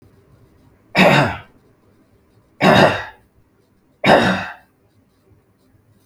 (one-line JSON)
{"three_cough_length": "6.1 s", "three_cough_amplitude": 32768, "three_cough_signal_mean_std_ratio": 0.36, "survey_phase": "beta (2021-08-13 to 2022-03-07)", "age": "45-64", "gender": "Male", "wearing_mask": "No", "symptom_sore_throat": true, "smoker_status": "Never smoked", "respiratory_condition_asthma": false, "respiratory_condition_other": false, "recruitment_source": "Test and Trace", "submission_delay": "3 days", "covid_test_result": "Negative", "covid_test_method": "RT-qPCR"}